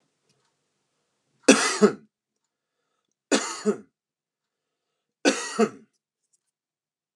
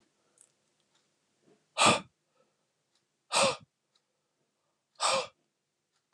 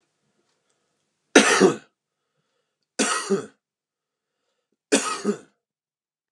{
  "three_cough_length": "7.2 s",
  "three_cough_amplitude": 32536,
  "three_cough_signal_mean_std_ratio": 0.25,
  "exhalation_length": "6.1 s",
  "exhalation_amplitude": 11743,
  "exhalation_signal_mean_std_ratio": 0.26,
  "cough_length": "6.3 s",
  "cough_amplitude": 32513,
  "cough_signal_mean_std_ratio": 0.29,
  "survey_phase": "alpha (2021-03-01 to 2021-08-12)",
  "age": "18-44",
  "gender": "Male",
  "wearing_mask": "No",
  "symptom_none": true,
  "symptom_onset": "5 days",
  "smoker_status": "Never smoked",
  "respiratory_condition_asthma": false,
  "respiratory_condition_other": false,
  "recruitment_source": "REACT",
  "submission_delay": "1 day",
  "covid_test_result": "Negative",
  "covid_test_method": "RT-qPCR",
  "covid_ct_value": 42.0,
  "covid_ct_gene": "N gene"
}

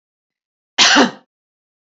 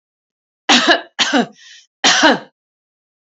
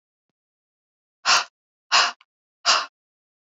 {
  "cough_length": "1.9 s",
  "cough_amplitude": 30382,
  "cough_signal_mean_std_ratio": 0.34,
  "three_cough_length": "3.2 s",
  "three_cough_amplitude": 30748,
  "three_cough_signal_mean_std_ratio": 0.43,
  "exhalation_length": "3.4 s",
  "exhalation_amplitude": 20111,
  "exhalation_signal_mean_std_ratio": 0.31,
  "survey_phase": "beta (2021-08-13 to 2022-03-07)",
  "age": "65+",
  "gender": "Female",
  "wearing_mask": "No",
  "symptom_none": true,
  "smoker_status": "Never smoked",
  "respiratory_condition_asthma": false,
  "respiratory_condition_other": false,
  "recruitment_source": "REACT",
  "submission_delay": "3 days",
  "covid_test_result": "Negative",
  "covid_test_method": "RT-qPCR",
  "influenza_a_test_result": "Negative",
  "influenza_b_test_result": "Negative"
}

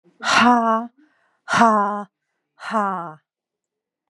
{
  "exhalation_length": "4.1 s",
  "exhalation_amplitude": 28499,
  "exhalation_signal_mean_std_ratio": 0.48,
  "survey_phase": "beta (2021-08-13 to 2022-03-07)",
  "age": "45-64",
  "gender": "Female",
  "wearing_mask": "No",
  "symptom_none": true,
  "smoker_status": "Never smoked",
  "respiratory_condition_asthma": false,
  "respiratory_condition_other": false,
  "recruitment_source": "REACT",
  "submission_delay": "1 day",
  "covid_test_result": "Negative",
  "covid_test_method": "RT-qPCR",
  "influenza_a_test_result": "Negative",
  "influenza_b_test_result": "Negative"
}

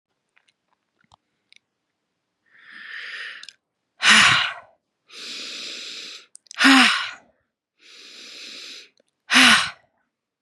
{
  "exhalation_length": "10.4 s",
  "exhalation_amplitude": 31904,
  "exhalation_signal_mean_std_ratio": 0.32,
  "survey_phase": "beta (2021-08-13 to 2022-03-07)",
  "age": "45-64",
  "gender": "Female",
  "wearing_mask": "No",
  "symptom_cough_any": true,
  "symptom_new_continuous_cough": true,
  "symptom_runny_or_blocked_nose": true,
  "symptom_shortness_of_breath": true,
  "symptom_sore_throat": true,
  "symptom_fatigue": true,
  "symptom_headache": true,
  "symptom_change_to_sense_of_smell_or_taste": true,
  "symptom_onset": "3 days",
  "smoker_status": "Never smoked",
  "respiratory_condition_asthma": false,
  "respiratory_condition_other": false,
  "recruitment_source": "Test and Trace",
  "submission_delay": "1 day",
  "covid_test_result": "Positive",
  "covid_test_method": "RT-qPCR",
  "covid_ct_value": 27.0,
  "covid_ct_gene": "N gene"
}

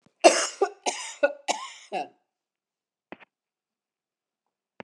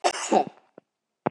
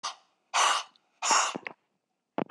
{
  "three_cough_length": "4.8 s",
  "three_cough_amplitude": 27791,
  "three_cough_signal_mean_std_ratio": 0.26,
  "cough_length": "1.3 s",
  "cough_amplitude": 15466,
  "cough_signal_mean_std_ratio": 0.38,
  "exhalation_length": "2.5 s",
  "exhalation_amplitude": 9864,
  "exhalation_signal_mean_std_ratio": 0.44,
  "survey_phase": "beta (2021-08-13 to 2022-03-07)",
  "age": "45-64",
  "gender": "Female",
  "wearing_mask": "No",
  "symptom_none": true,
  "smoker_status": "Never smoked",
  "respiratory_condition_asthma": false,
  "respiratory_condition_other": false,
  "recruitment_source": "REACT",
  "submission_delay": "3 days",
  "covid_test_result": "Negative",
  "covid_test_method": "RT-qPCR",
  "influenza_a_test_result": "Negative",
  "influenza_b_test_result": "Negative"
}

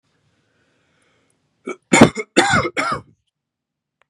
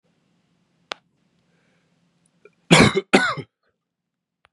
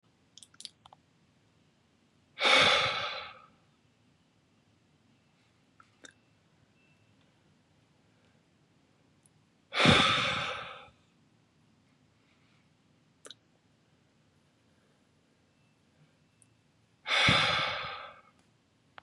{
  "three_cough_length": "4.1 s",
  "three_cough_amplitude": 32768,
  "three_cough_signal_mean_std_ratio": 0.3,
  "cough_length": "4.5 s",
  "cough_amplitude": 32768,
  "cough_signal_mean_std_ratio": 0.24,
  "exhalation_length": "19.0 s",
  "exhalation_amplitude": 11642,
  "exhalation_signal_mean_std_ratio": 0.29,
  "survey_phase": "beta (2021-08-13 to 2022-03-07)",
  "age": "18-44",
  "gender": "Male",
  "wearing_mask": "No",
  "symptom_cough_any": true,
  "symptom_runny_or_blocked_nose": true,
  "symptom_fatigue": true,
  "smoker_status": "Never smoked",
  "respiratory_condition_asthma": false,
  "respiratory_condition_other": false,
  "recruitment_source": "Test and Trace",
  "submission_delay": "1 day",
  "covid_test_result": "Positive",
  "covid_test_method": "RT-qPCR",
  "covid_ct_value": 22.1,
  "covid_ct_gene": "S gene"
}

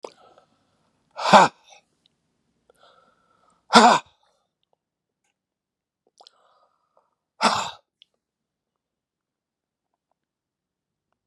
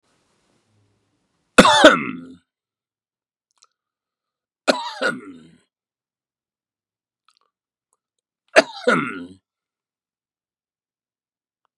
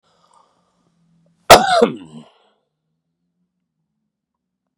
{
  "exhalation_length": "11.3 s",
  "exhalation_amplitude": 32767,
  "exhalation_signal_mean_std_ratio": 0.18,
  "three_cough_length": "11.8 s",
  "three_cough_amplitude": 32768,
  "three_cough_signal_mean_std_ratio": 0.21,
  "cough_length": "4.8 s",
  "cough_amplitude": 32768,
  "cough_signal_mean_std_ratio": 0.21,
  "survey_phase": "beta (2021-08-13 to 2022-03-07)",
  "age": "65+",
  "gender": "Male",
  "wearing_mask": "No",
  "symptom_none": true,
  "smoker_status": "Never smoked",
  "respiratory_condition_asthma": false,
  "respiratory_condition_other": false,
  "recruitment_source": "REACT",
  "submission_delay": "3 days",
  "covid_test_result": "Negative",
  "covid_test_method": "RT-qPCR",
  "influenza_a_test_result": "Negative",
  "influenza_b_test_result": "Negative"
}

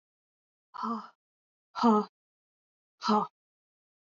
{
  "exhalation_length": "4.1 s",
  "exhalation_amplitude": 8548,
  "exhalation_signal_mean_std_ratio": 0.31,
  "survey_phase": "beta (2021-08-13 to 2022-03-07)",
  "age": "18-44",
  "gender": "Female",
  "wearing_mask": "No",
  "symptom_runny_or_blocked_nose": true,
  "symptom_fatigue": true,
  "smoker_status": "Never smoked",
  "respiratory_condition_asthma": false,
  "respiratory_condition_other": false,
  "recruitment_source": "REACT",
  "submission_delay": "0 days",
  "covid_test_result": "Negative",
  "covid_test_method": "RT-qPCR",
  "influenza_a_test_result": "Negative",
  "influenza_b_test_result": "Negative"
}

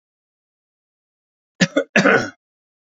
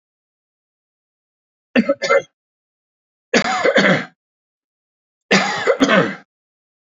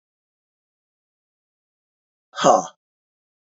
{
  "cough_length": "2.9 s",
  "cough_amplitude": 28223,
  "cough_signal_mean_std_ratio": 0.29,
  "three_cough_length": "7.0 s",
  "three_cough_amplitude": 31359,
  "three_cough_signal_mean_std_ratio": 0.39,
  "exhalation_length": "3.6 s",
  "exhalation_amplitude": 26826,
  "exhalation_signal_mean_std_ratio": 0.19,
  "survey_phase": "beta (2021-08-13 to 2022-03-07)",
  "age": "65+",
  "gender": "Male",
  "wearing_mask": "No",
  "symptom_none": true,
  "smoker_status": "Never smoked",
  "respiratory_condition_asthma": false,
  "respiratory_condition_other": false,
  "recruitment_source": "REACT",
  "submission_delay": "1 day",
  "covid_test_result": "Negative",
  "covid_test_method": "RT-qPCR",
  "influenza_a_test_result": "Negative",
  "influenza_b_test_result": "Negative"
}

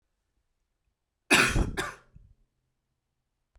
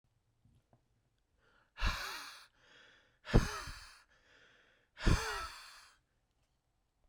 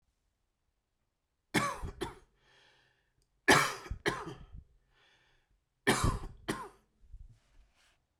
{
  "cough_length": "3.6 s",
  "cough_amplitude": 14853,
  "cough_signal_mean_std_ratio": 0.28,
  "exhalation_length": "7.1 s",
  "exhalation_amplitude": 6430,
  "exhalation_signal_mean_std_ratio": 0.28,
  "three_cough_length": "8.2 s",
  "three_cough_amplitude": 9235,
  "three_cough_signal_mean_std_ratio": 0.31,
  "survey_phase": "beta (2021-08-13 to 2022-03-07)",
  "age": "18-44",
  "gender": "Male",
  "wearing_mask": "No",
  "symptom_cough_any": true,
  "symptom_new_continuous_cough": true,
  "symptom_runny_or_blocked_nose": true,
  "symptom_shortness_of_breath": true,
  "symptom_sore_throat": true,
  "symptom_fatigue": true,
  "symptom_headache": true,
  "smoker_status": "Ex-smoker",
  "respiratory_condition_asthma": false,
  "respiratory_condition_other": false,
  "recruitment_source": "Test and Trace",
  "submission_delay": "1 day",
  "covid_test_result": "Positive",
  "covid_test_method": "LFT"
}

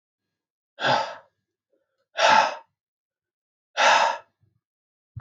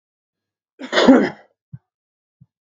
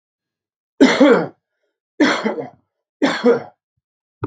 {
  "exhalation_length": "5.2 s",
  "exhalation_amplitude": 20129,
  "exhalation_signal_mean_std_ratio": 0.35,
  "cough_length": "2.6 s",
  "cough_amplitude": 32768,
  "cough_signal_mean_std_ratio": 0.29,
  "three_cough_length": "4.3 s",
  "three_cough_amplitude": 32768,
  "three_cough_signal_mean_std_ratio": 0.41,
  "survey_phase": "beta (2021-08-13 to 2022-03-07)",
  "age": "45-64",
  "gender": "Male",
  "wearing_mask": "No",
  "symptom_cough_any": true,
  "symptom_runny_or_blocked_nose": true,
  "symptom_onset": "4 days",
  "smoker_status": "Ex-smoker",
  "respiratory_condition_asthma": false,
  "respiratory_condition_other": false,
  "recruitment_source": "REACT",
  "submission_delay": "1 day",
  "covid_test_result": "Negative",
  "covid_test_method": "RT-qPCR"
}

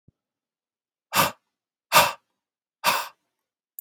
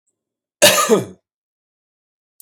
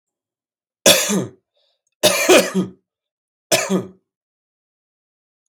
{
  "exhalation_length": "3.8 s",
  "exhalation_amplitude": 25836,
  "exhalation_signal_mean_std_ratio": 0.28,
  "cough_length": "2.4 s",
  "cough_amplitude": 32768,
  "cough_signal_mean_std_ratio": 0.32,
  "three_cough_length": "5.5 s",
  "three_cough_amplitude": 32768,
  "three_cough_signal_mean_std_ratio": 0.35,
  "survey_phase": "beta (2021-08-13 to 2022-03-07)",
  "age": "45-64",
  "gender": "Male",
  "wearing_mask": "No",
  "symptom_cough_any": true,
  "symptom_runny_or_blocked_nose": true,
  "symptom_fatigue": true,
  "symptom_other": true,
  "symptom_onset": "2 days",
  "smoker_status": "Current smoker (1 to 10 cigarettes per day)",
  "respiratory_condition_asthma": false,
  "respiratory_condition_other": false,
  "recruitment_source": "Test and Trace",
  "submission_delay": "1 day",
  "covid_test_result": "Positive",
  "covid_test_method": "ePCR"
}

